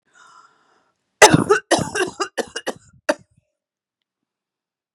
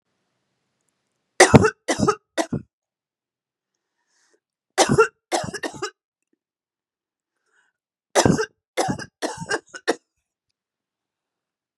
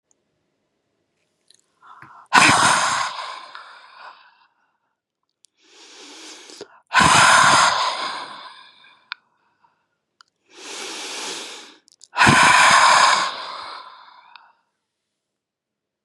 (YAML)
cough_length: 4.9 s
cough_amplitude: 32768
cough_signal_mean_std_ratio: 0.27
three_cough_length: 11.8 s
three_cough_amplitude: 32768
three_cough_signal_mean_std_ratio: 0.27
exhalation_length: 16.0 s
exhalation_amplitude: 32768
exhalation_signal_mean_std_ratio: 0.4
survey_phase: beta (2021-08-13 to 2022-03-07)
age: 45-64
gender: Female
wearing_mask: 'No'
symptom_cough_any: true
symptom_new_continuous_cough: true
symptom_runny_or_blocked_nose: true
symptom_shortness_of_breath: true
symptom_diarrhoea: true
symptom_fatigue: true
symptom_change_to_sense_of_smell_or_taste: true
symptom_onset: 4 days
smoker_status: Ex-smoker
respiratory_condition_asthma: false
respiratory_condition_other: false
recruitment_source: Test and Trace
submission_delay: 2 days
covid_test_result: Positive
covid_test_method: RT-qPCR
covid_ct_value: 15.6
covid_ct_gene: ORF1ab gene
covid_ct_mean: 15.8
covid_viral_load: 6600000 copies/ml
covid_viral_load_category: High viral load (>1M copies/ml)